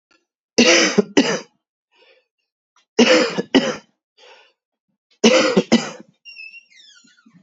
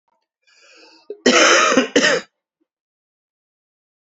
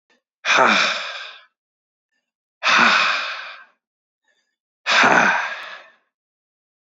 {"three_cough_length": "7.4 s", "three_cough_amplitude": 30403, "three_cough_signal_mean_std_ratio": 0.39, "cough_length": "4.0 s", "cough_amplitude": 29305, "cough_signal_mean_std_ratio": 0.39, "exhalation_length": "6.9 s", "exhalation_amplitude": 27651, "exhalation_signal_mean_std_ratio": 0.45, "survey_phase": "beta (2021-08-13 to 2022-03-07)", "age": "18-44", "gender": "Male", "wearing_mask": "No", "symptom_runny_or_blocked_nose": true, "symptom_shortness_of_breath": true, "symptom_fatigue": true, "symptom_headache": true, "smoker_status": "Ex-smoker", "respiratory_condition_asthma": true, "respiratory_condition_other": false, "recruitment_source": "Test and Trace", "submission_delay": "1 day", "covid_test_result": "Positive", "covid_test_method": "RT-qPCR", "covid_ct_value": 15.8, "covid_ct_gene": "ORF1ab gene", "covid_ct_mean": 16.5, "covid_viral_load": "3900000 copies/ml", "covid_viral_load_category": "High viral load (>1M copies/ml)"}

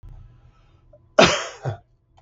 {"three_cough_length": "2.2 s", "three_cough_amplitude": 32766, "three_cough_signal_mean_std_ratio": 0.29, "survey_phase": "beta (2021-08-13 to 2022-03-07)", "age": "65+", "gender": "Male", "wearing_mask": "No", "symptom_none": true, "smoker_status": "Never smoked", "respiratory_condition_asthma": false, "respiratory_condition_other": false, "recruitment_source": "REACT", "submission_delay": "1 day", "covid_test_result": "Negative", "covid_test_method": "RT-qPCR", "influenza_a_test_result": "Negative", "influenza_b_test_result": "Negative"}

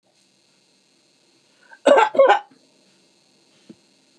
{"cough_length": "4.2 s", "cough_amplitude": 27730, "cough_signal_mean_std_ratio": 0.27, "survey_phase": "beta (2021-08-13 to 2022-03-07)", "age": "65+", "gender": "Female", "wearing_mask": "No", "symptom_none": true, "smoker_status": "Never smoked", "respiratory_condition_asthma": false, "respiratory_condition_other": false, "recruitment_source": "REACT", "submission_delay": "2 days", "covid_test_result": "Negative", "covid_test_method": "RT-qPCR", "influenza_a_test_result": "Negative", "influenza_b_test_result": "Negative"}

